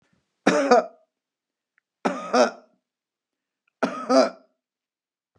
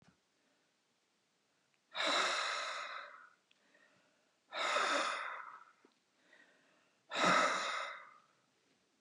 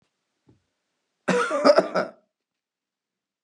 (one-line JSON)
{"three_cough_length": "5.4 s", "three_cough_amplitude": 22865, "three_cough_signal_mean_std_ratio": 0.33, "exhalation_length": "9.0 s", "exhalation_amplitude": 4078, "exhalation_signal_mean_std_ratio": 0.45, "cough_length": "3.4 s", "cough_amplitude": 24154, "cough_signal_mean_std_ratio": 0.32, "survey_phase": "beta (2021-08-13 to 2022-03-07)", "age": "65+", "gender": "Female", "wearing_mask": "No", "symptom_none": true, "smoker_status": "Ex-smoker", "respiratory_condition_asthma": false, "respiratory_condition_other": false, "recruitment_source": "REACT", "submission_delay": "2 days", "covid_test_result": "Negative", "covid_test_method": "RT-qPCR"}